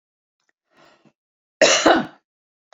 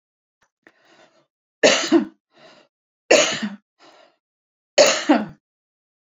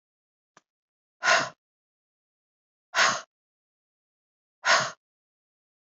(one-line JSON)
{"cough_length": "2.7 s", "cough_amplitude": 29194, "cough_signal_mean_std_ratio": 0.3, "three_cough_length": "6.1 s", "three_cough_amplitude": 31241, "three_cough_signal_mean_std_ratio": 0.32, "exhalation_length": "5.8 s", "exhalation_amplitude": 12828, "exhalation_signal_mean_std_ratio": 0.27, "survey_phase": "beta (2021-08-13 to 2022-03-07)", "age": "45-64", "gender": "Female", "wearing_mask": "No", "symptom_none": true, "smoker_status": "Ex-smoker", "respiratory_condition_asthma": false, "respiratory_condition_other": false, "recruitment_source": "REACT", "submission_delay": "1 day", "covid_test_result": "Negative", "covid_test_method": "RT-qPCR"}